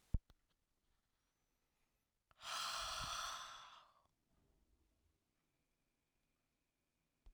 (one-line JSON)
{"exhalation_length": "7.3 s", "exhalation_amplitude": 2032, "exhalation_signal_mean_std_ratio": 0.32, "survey_phase": "alpha (2021-03-01 to 2021-08-12)", "age": "45-64", "gender": "Male", "wearing_mask": "No", "symptom_fatigue": true, "smoker_status": "Never smoked", "respiratory_condition_asthma": false, "respiratory_condition_other": false, "recruitment_source": "Test and Trace", "submission_delay": "2 days", "covid_test_result": "Positive", "covid_test_method": "RT-qPCR", "covid_ct_value": 35.5, "covid_ct_gene": "N gene"}